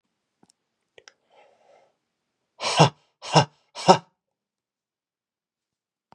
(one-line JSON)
{"exhalation_length": "6.1 s", "exhalation_amplitude": 31790, "exhalation_signal_mean_std_ratio": 0.2, "survey_phase": "beta (2021-08-13 to 2022-03-07)", "age": "18-44", "gender": "Male", "wearing_mask": "No", "symptom_cough_any": true, "symptom_runny_or_blocked_nose": true, "symptom_shortness_of_breath": true, "symptom_fatigue": true, "symptom_onset": "4 days", "smoker_status": "Never smoked", "respiratory_condition_asthma": false, "respiratory_condition_other": false, "recruitment_source": "Test and Trace", "submission_delay": "1 day", "covid_test_result": "Positive", "covid_test_method": "RT-qPCR"}